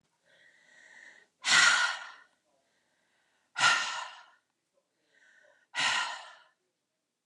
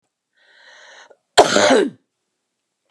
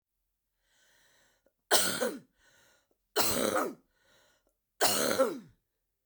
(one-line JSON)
{"exhalation_length": "7.3 s", "exhalation_amplitude": 11337, "exhalation_signal_mean_std_ratio": 0.34, "cough_length": "2.9 s", "cough_amplitude": 32768, "cough_signal_mean_std_ratio": 0.33, "three_cough_length": "6.1 s", "three_cough_amplitude": 13417, "three_cough_signal_mean_std_ratio": 0.4, "survey_phase": "beta (2021-08-13 to 2022-03-07)", "age": "45-64", "gender": "Female", "wearing_mask": "No", "symptom_cough_any": true, "symptom_runny_or_blocked_nose": true, "symptom_sore_throat": true, "symptom_fatigue": true, "symptom_headache": true, "symptom_change_to_sense_of_smell_or_taste": true, "symptom_onset": "4 days", "smoker_status": "Ex-smoker", "respiratory_condition_asthma": false, "respiratory_condition_other": false, "recruitment_source": "Test and Trace", "submission_delay": "2 days", "covid_test_result": "Positive", "covid_test_method": "RT-qPCR"}